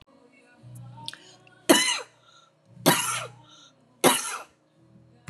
{"three_cough_length": "5.3 s", "three_cough_amplitude": 26036, "three_cough_signal_mean_std_ratio": 0.34, "survey_phase": "beta (2021-08-13 to 2022-03-07)", "age": "65+", "gender": "Female", "wearing_mask": "No", "symptom_none": true, "smoker_status": "Never smoked", "respiratory_condition_asthma": false, "respiratory_condition_other": false, "recruitment_source": "REACT", "submission_delay": "5 days", "covid_test_result": "Negative", "covid_test_method": "RT-qPCR", "influenza_a_test_result": "Negative", "influenza_b_test_result": "Negative"}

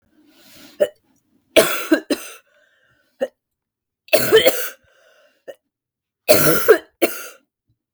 {"three_cough_length": "7.9 s", "three_cough_amplitude": 32768, "three_cough_signal_mean_std_ratio": 0.35, "survey_phase": "beta (2021-08-13 to 2022-03-07)", "age": "18-44", "gender": "Female", "wearing_mask": "No", "symptom_cough_any": true, "symptom_runny_or_blocked_nose": true, "symptom_sore_throat": true, "symptom_abdominal_pain": true, "symptom_fatigue": true, "symptom_headache": true, "symptom_onset": "3 days", "smoker_status": "Never smoked", "respiratory_condition_asthma": false, "respiratory_condition_other": false, "recruitment_source": "REACT", "submission_delay": "1 day", "covid_test_result": "Negative", "covid_test_method": "RT-qPCR", "influenza_a_test_result": "Unknown/Void", "influenza_b_test_result": "Unknown/Void"}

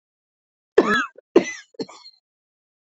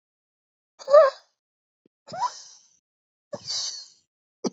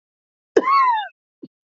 {"three_cough_length": "2.9 s", "three_cough_amplitude": 29194, "three_cough_signal_mean_std_ratio": 0.27, "exhalation_length": "4.5 s", "exhalation_amplitude": 22502, "exhalation_signal_mean_std_ratio": 0.26, "cough_length": "1.7 s", "cough_amplitude": 27104, "cough_signal_mean_std_ratio": 0.46, "survey_phase": "beta (2021-08-13 to 2022-03-07)", "age": "45-64", "gender": "Male", "wearing_mask": "No", "symptom_cough_any": true, "symptom_new_continuous_cough": true, "symptom_shortness_of_breath": true, "symptom_sore_throat": true, "symptom_fatigue": true, "symptom_fever_high_temperature": true, "symptom_headache": true, "symptom_change_to_sense_of_smell_or_taste": true, "symptom_loss_of_taste": true, "symptom_onset": "2 days", "smoker_status": "Ex-smoker", "respiratory_condition_asthma": true, "respiratory_condition_other": false, "recruitment_source": "Test and Trace", "submission_delay": "2 days", "covid_test_result": "Positive", "covid_test_method": "ePCR"}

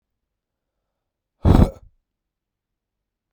{"exhalation_length": "3.3 s", "exhalation_amplitude": 31202, "exhalation_signal_mean_std_ratio": 0.21, "survey_phase": "beta (2021-08-13 to 2022-03-07)", "age": "18-44", "gender": "Male", "wearing_mask": "No", "symptom_cough_any": true, "symptom_runny_or_blocked_nose": true, "symptom_shortness_of_breath": true, "symptom_fatigue": true, "symptom_headache": true, "symptom_onset": "2 days", "smoker_status": "Ex-smoker", "respiratory_condition_asthma": false, "respiratory_condition_other": false, "recruitment_source": "Test and Trace", "submission_delay": "2 days", "covid_test_result": "Positive", "covid_test_method": "RT-qPCR", "covid_ct_value": 23.1, "covid_ct_gene": "N gene"}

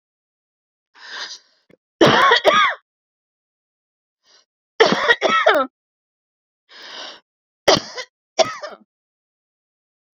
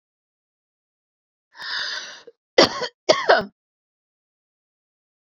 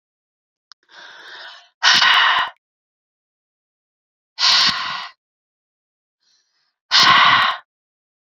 {"three_cough_length": "10.2 s", "three_cough_amplitude": 29666, "three_cough_signal_mean_std_ratio": 0.34, "cough_length": "5.3 s", "cough_amplitude": 29540, "cough_signal_mean_std_ratio": 0.26, "exhalation_length": "8.4 s", "exhalation_amplitude": 32707, "exhalation_signal_mean_std_ratio": 0.39, "survey_phase": "beta (2021-08-13 to 2022-03-07)", "age": "45-64", "gender": "Female", "wearing_mask": "No", "symptom_cough_any": true, "symptom_fatigue": true, "symptom_change_to_sense_of_smell_or_taste": true, "symptom_loss_of_taste": true, "symptom_onset": "3 days", "smoker_status": "Ex-smoker", "respiratory_condition_asthma": false, "respiratory_condition_other": false, "recruitment_source": "Test and Trace", "submission_delay": "2 days", "covid_test_result": "Positive", "covid_test_method": "RT-qPCR", "covid_ct_value": 21.1, "covid_ct_gene": "N gene", "covid_ct_mean": 21.6, "covid_viral_load": "85000 copies/ml", "covid_viral_load_category": "Low viral load (10K-1M copies/ml)"}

